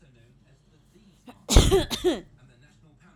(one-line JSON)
{"cough_length": "3.2 s", "cough_amplitude": 28861, "cough_signal_mean_std_ratio": 0.32, "survey_phase": "alpha (2021-03-01 to 2021-08-12)", "age": "18-44", "gender": "Female", "wearing_mask": "No", "symptom_none": true, "smoker_status": "Never smoked", "respiratory_condition_asthma": true, "respiratory_condition_other": false, "recruitment_source": "REACT", "submission_delay": "4 days", "covid_test_result": "Negative", "covid_test_method": "RT-qPCR"}